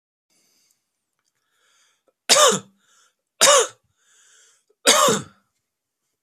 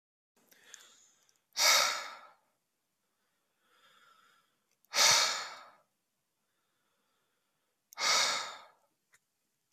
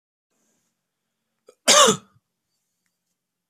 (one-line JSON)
{"three_cough_length": "6.2 s", "three_cough_amplitude": 32767, "three_cough_signal_mean_std_ratio": 0.3, "exhalation_length": "9.7 s", "exhalation_amplitude": 8352, "exhalation_signal_mean_std_ratio": 0.31, "cough_length": "3.5 s", "cough_amplitude": 26121, "cough_signal_mean_std_ratio": 0.22, "survey_phase": "beta (2021-08-13 to 2022-03-07)", "age": "18-44", "gender": "Male", "wearing_mask": "No", "symptom_runny_or_blocked_nose": true, "symptom_shortness_of_breath": true, "symptom_sore_throat": true, "symptom_abdominal_pain": true, "symptom_diarrhoea": true, "symptom_fatigue": true, "symptom_fever_high_temperature": true, "symptom_headache": true, "smoker_status": "Current smoker (e-cigarettes or vapes only)", "respiratory_condition_asthma": false, "respiratory_condition_other": false, "recruitment_source": "Test and Trace", "submission_delay": "2 days", "covid_test_result": "Positive", "covid_test_method": "ePCR"}